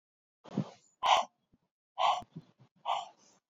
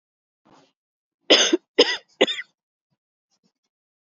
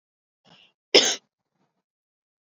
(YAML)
exhalation_length: 3.5 s
exhalation_amplitude: 8702
exhalation_signal_mean_std_ratio: 0.35
three_cough_length: 4.0 s
three_cough_amplitude: 28672
three_cough_signal_mean_std_ratio: 0.26
cough_length: 2.6 s
cough_amplitude: 32673
cough_signal_mean_std_ratio: 0.19
survey_phase: alpha (2021-03-01 to 2021-08-12)
age: 45-64
gender: Female
wearing_mask: 'No'
symptom_cough_any: true
symptom_fatigue: true
symptom_headache: true
smoker_status: Never smoked
respiratory_condition_asthma: false
respiratory_condition_other: false
recruitment_source: Test and Trace
submission_delay: 2 days
covid_test_result: Positive
covid_test_method: RT-qPCR